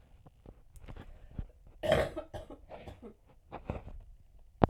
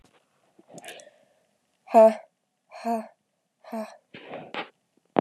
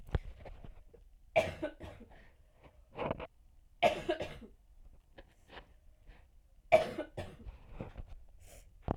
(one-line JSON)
{"cough_length": "4.7 s", "cough_amplitude": 22108, "cough_signal_mean_std_ratio": 0.34, "exhalation_length": "5.2 s", "exhalation_amplitude": 25587, "exhalation_signal_mean_std_ratio": 0.24, "three_cough_length": "9.0 s", "three_cough_amplitude": 8231, "three_cough_signal_mean_std_ratio": 0.35, "survey_phase": "alpha (2021-03-01 to 2021-08-12)", "age": "18-44", "gender": "Female", "wearing_mask": "No", "symptom_shortness_of_breath": true, "symptom_abdominal_pain": true, "symptom_fatigue": true, "symptom_fever_high_temperature": true, "symptom_headache": true, "smoker_status": "Never smoked", "respiratory_condition_asthma": false, "respiratory_condition_other": false, "recruitment_source": "Test and Trace", "submission_delay": "1 day", "covid_test_result": "Positive", "covid_test_method": "LFT"}